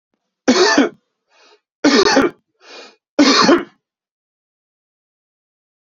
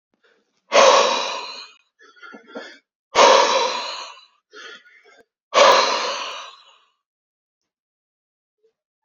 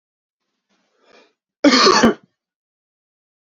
{"three_cough_length": "5.8 s", "three_cough_amplitude": 32768, "three_cough_signal_mean_std_ratio": 0.4, "exhalation_length": "9.0 s", "exhalation_amplitude": 29113, "exhalation_signal_mean_std_ratio": 0.38, "cough_length": "3.5 s", "cough_amplitude": 30678, "cough_signal_mean_std_ratio": 0.3, "survey_phase": "beta (2021-08-13 to 2022-03-07)", "age": "18-44", "gender": "Male", "wearing_mask": "No", "symptom_cough_any": true, "symptom_shortness_of_breath": true, "symptom_sore_throat": true, "symptom_fatigue": true, "symptom_other": true, "symptom_onset": "4 days", "smoker_status": "Ex-smoker", "respiratory_condition_asthma": false, "respiratory_condition_other": false, "recruitment_source": "Test and Trace", "submission_delay": "2 days", "covid_test_result": "Positive", "covid_test_method": "ePCR"}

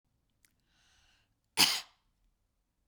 {"cough_length": "2.9 s", "cough_amplitude": 12719, "cough_signal_mean_std_ratio": 0.2, "survey_phase": "beta (2021-08-13 to 2022-03-07)", "age": "45-64", "gender": "Female", "wearing_mask": "Yes", "symptom_none": true, "smoker_status": "Never smoked", "respiratory_condition_asthma": false, "respiratory_condition_other": false, "recruitment_source": "REACT", "submission_delay": "2 days", "covid_test_result": "Negative", "covid_test_method": "RT-qPCR", "influenza_a_test_result": "Negative", "influenza_b_test_result": "Negative"}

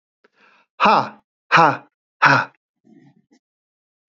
{"exhalation_length": "4.2 s", "exhalation_amplitude": 28335, "exhalation_signal_mean_std_ratio": 0.32, "survey_phase": "beta (2021-08-13 to 2022-03-07)", "age": "45-64", "gender": "Male", "wearing_mask": "No", "symptom_none": true, "smoker_status": "Ex-smoker", "respiratory_condition_asthma": false, "respiratory_condition_other": false, "recruitment_source": "Test and Trace", "submission_delay": "1 day", "covid_test_result": "Positive", "covid_test_method": "ePCR"}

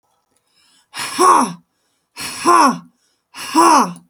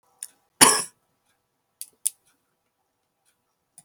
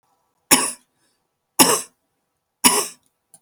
{"exhalation_length": "4.1 s", "exhalation_amplitude": 31928, "exhalation_signal_mean_std_ratio": 0.47, "cough_length": "3.8 s", "cough_amplitude": 32768, "cough_signal_mean_std_ratio": 0.17, "three_cough_length": "3.4 s", "three_cough_amplitude": 32768, "three_cough_signal_mean_std_ratio": 0.31, "survey_phase": "beta (2021-08-13 to 2022-03-07)", "age": "65+", "gender": "Female", "wearing_mask": "No", "symptom_none": true, "smoker_status": "Ex-smoker", "respiratory_condition_asthma": false, "respiratory_condition_other": false, "recruitment_source": "REACT", "submission_delay": "7 days", "covid_test_result": "Negative", "covid_test_method": "RT-qPCR", "influenza_a_test_result": "Negative", "influenza_b_test_result": "Negative"}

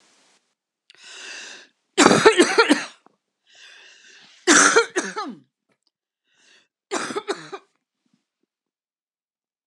{"three_cough_length": "9.7 s", "three_cough_amplitude": 32768, "three_cough_signal_mean_std_ratio": 0.31, "survey_phase": "beta (2021-08-13 to 2022-03-07)", "age": "65+", "gender": "Female", "wearing_mask": "No", "symptom_none": true, "smoker_status": "Never smoked", "respiratory_condition_asthma": false, "respiratory_condition_other": false, "recruitment_source": "REACT", "submission_delay": "5 days", "covid_test_result": "Negative", "covid_test_method": "RT-qPCR", "influenza_a_test_result": "Negative", "influenza_b_test_result": "Negative"}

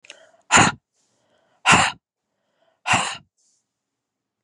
{"exhalation_length": "4.4 s", "exhalation_amplitude": 32718, "exhalation_signal_mean_std_ratio": 0.3, "survey_phase": "beta (2021-08-13 to 2022-03-07)", "age": "18-44", "gender": "Female", "wearing_mask": "No", "symptom_cough_any": true, "symptom_runny_or_blocked_nose": true, "symptom_fever_high_temperature": true, "symptom_onset": "4 days", "smoker_status": "Never smoked", "respiratory_condition_asthma": false, "respiratory_condition_other": false, "recruitment_source": "Test and Trace", "submission_delay": "1 day", "covid_test_result": "Negative", "covid_test_method": "RT-qPCR"}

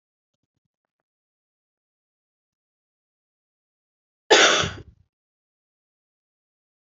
{"cough_length": "7.0 s", "cough_amplitude": 28228, "cough_signal_mean_std_ratio": 0.18, "survey_phase": "alpha (2021-03-01 to 2021-08-12)", "age": "18-44", "gender": "Female", "wearing_mask": "No", "symptom_cough_any": true, "symptom_shortness_of_breath": true, "symptom_fatigue": true, "symptom_fever_high_temperature": true, "symptom_headache": true, "symptom_onset": "3 days", "smoker_status": "Never smoked", "respiratory_condition_asthma": false, "respiratory_condition_other": false, "recruitment_source": "Test and Trace", "submission_delay": "1 day", "covid_test_result": "Positive", "covid_test_method": "ePCR"}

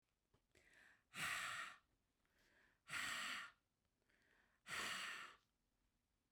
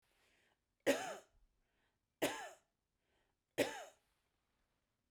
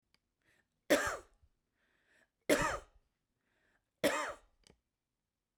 {"exhalation_length": "6.3 s", "exhalation_amplitude": 652, "exhalation_signal_mean_std_ratio": 0.47, "three_cough_length": "5.1 s", "three_cough_amplitude": 2743, "three_cough_signal_mean_std_ratio": 0.26, "cough_length": "5.6 s", "cough_amplitude": 5769, "cough_signal_mean_std_ratio": 0.29, "survey_phase": "beta (2021-08-13 to 2022-03-07)", "age": "45-64", "gender": "Female", "wearing_mask": "No", "symptom_none": true, "symptom_onset": "6 days", "smoker_status": "Never smoked", "respiratory_condition_asthma": false, "respiratory_condition_other": false, "recruitment_source": "REACT", "submission_delay": "2 days", "covid_test_result": "Negative", "covid_test_method": "RT-qPCR"}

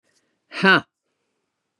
{"exhalation_length": "1.8 s", "exhalation_amplitude": 30690, "exhalation_signal_mean_std_ratio": 0.25, "survey_phase": "beta (2021-08-13 to 2022-03-07)", "age": "65+", "gender": "Female", "wearing_mask": "No", "symptom_cough_any": true, "symptom_onset": "6 days", "smoker_status": "Never smoked", "respiratory_condition_asthma": false, "respiratory_condition_other": false, "recruitment_source": "Test and Trace", "submission_delay": "1 day", "covid_test_result": "Positive", "covid_test_method": "RT-qPCR", "covid_ct_value": 29.1, "covid_ct_gene": "N gene"}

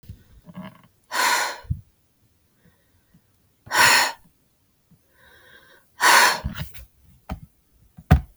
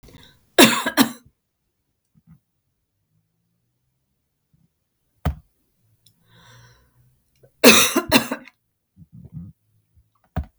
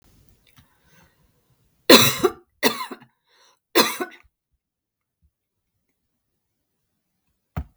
{"exhalation_length": "8.4 s", "exhalation_amplitude": 31046, "exhalation_signal_mean_std_ratio": 0.34, "cough_length": "10.6 s", "cough_amplitude": 32768, "cough_signal_mean_std_ratio": 0.23, "three_cough_length": "7.8 s", "three_cough_amplitude": 32768, "three_cough_signal_mean_std_ratio": 0.22, "survey_phase": "beta (2021-08-13 to 2022-03-07)", "age": "65+", "gender": "Female", "wearing_mask": "No", "symptom_none": true, "smoker_status": "Never smoked", "respiratory_condition_asthma": false, "respiratory_condition_other": false, "recruitment_source": "REACT", "submission_delay": "3 days", "covid_test_result": "Negative", "covid_test_method": "RT-qPCR", "influenza_a_test_result": "Unknown/Void", "influenza_b_test_result": "Unknown/Void"}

